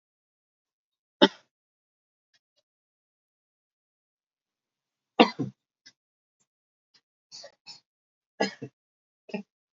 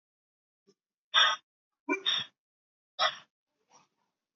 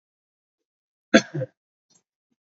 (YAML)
three_cough_length: 9.7 s
three_cough_amplitude: 26318
three_cough_signal_mean_std_ratio: 0.13
exhalation_length: 4.4 s
exhalation_amplitude: 11148
exhalation_signal_mean_std_ratio: 0.29
cough_length: 2.6 s
cough_amplitude: 27320
cough_signal_mean_std_ratio: 0.16
survey_phase: beta (2021-08-13 to 2022-03-07)
age: 18-44
gender: Male
wearing_mask: 'No'
symptom_sore_throat: true
symptom_headache: true
symptom_onset: 4 days
smoker_status: Current smoker (e-cigarettes or vapes only)
respiratory_condition_asthma: false
respiratory_condition_other: false
recruitment_source: Test and Trace
submission_delay: 2 days
covid_test_result: Positive
covid_test_method: RT-qPCR
covid_ct_value: 23.4
covid_ct_gene: ORF1ab gene